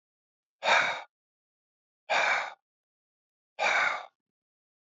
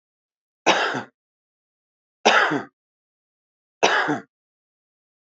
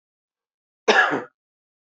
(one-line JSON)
{"exhalation_length": "4.9 s", "exhalation_amplitude": 8815, "exhalation_signal_mean_std_ratio": 0.39, "three_cough_length": "5.3 s", "three_cough_amplitude": 29214, "three_cough_signal_mean_std_ratio": 0.34, "cough_length": "2.0 s", "cough_amplitude": 24034, "cough_signal_mean_std_ratio": 0.31, "survey_phase": "beta (2021-08-13 to 2022-03-07)", "age": "45-64", "gender": "Male", "wearing_mask": "No", "symptom_none": true, "smoker_status": "Current smoker (1 to 10 cigarettes per day)", "respiratory_condition_asthma": false, "respiratory_condition_other": false, "recruitment_source": "REACT", "submission_delay": "1 day", "covid_test_result": "Negative", "covid_test_method": "RT-qPCR"}